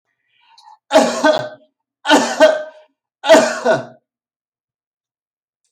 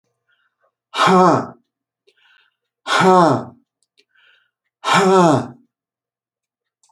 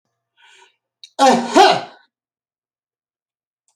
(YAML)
three_cough_length: 5.7 s
three_cough_amplitude: 31755
three_cough_signal_mean_std_ratio: 0.4
exhalation_length: 6.9 s
exhalation_amplitude: 28791
exhalation_signal_mean_std_ratio: 0.4
cough_length: 3.8 s
cough_amplitude: 31526
cough_signal_mean_std_ratio: 0.3
survey_phase: beta (2021-08-13 to 2022-03-07)
age: 45-64
gender: Male
wearing_mask: 'No'
symptom_none: true
smoker_status: Never smoked
respiratory_condition_asthma: false
respiratory_condition_other: false
recruitment_source: REACT
submission_delay: 1 day
covid_test_result: Negative
covid_test_method: RT-qPCR